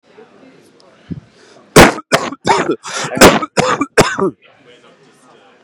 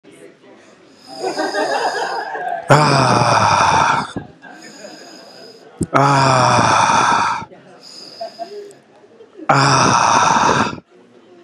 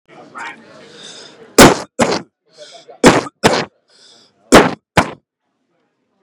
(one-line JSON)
{"cough_length": "5.6 s", "cough_amplitude": 32768, "cough_signal_mean_std_ratio": 0.4, "exhalation_length": "11.4 s", "exhalation_amplitude": 32768, "exhalation_signal_mean_std_ratio": 0.65, "three_cough_length": "6.2 s", "three_cough_amplitude": 32768, "three_cough_signal_mean_std_ratio": 0.32, "survey_phase": "beta (2021-08-13 to 2022-03-07)", "age": "18-44", "gender": "Male", "wearing_mask": "Yes", "symptom_shortness_of_breath": true, "symptom_fatigue": true, "symptom_other": true, "symptom_onset": "12 days", "smoker_status": "Ex-smoker", "respiratory_condition_asthma": false, "respiratory_condition_other": false, "recruitment_source": "REACT", "submission_delay": "6 days", "covid_test_result": "Negative", "covid_test_method": "RT-qPCR", "influenza_a_test_result": "Positive", "influenza_a_ct_value": 31.2, "influenza_b_test_result": "Positive", "influenza_b_ct_value": 31.8}